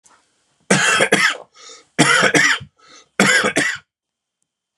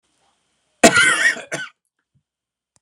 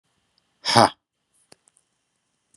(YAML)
three_cough_length: 4.8 s
three_cough_amplitude: 32767
three_cough_signal_mean_std_ratio: 0.51
cough_length: 2.8 s
cough_amplitude: 32768
cough_signal_mean_std_ratio: 0.34
exhalation_length: 2.6 s
exhalation_amplitude: 32767
exhalation_signal_mean_std_ratio: 0.2
survey_phase: beta (2021-08-13 to 2022-03-07)
age: 45-64
gender: Male
wearing_mask: 'No'
symptom_sore_throat: true
smoker_status: Current smoker (1 to 10 cigarettes per day)
respiratory_condition_asthma: false
respiratory_condition_other: false
recruitment_source: REACT
submission_delay: 0 days
covid_test_result: Negative
covid_test_method: RT-qPCR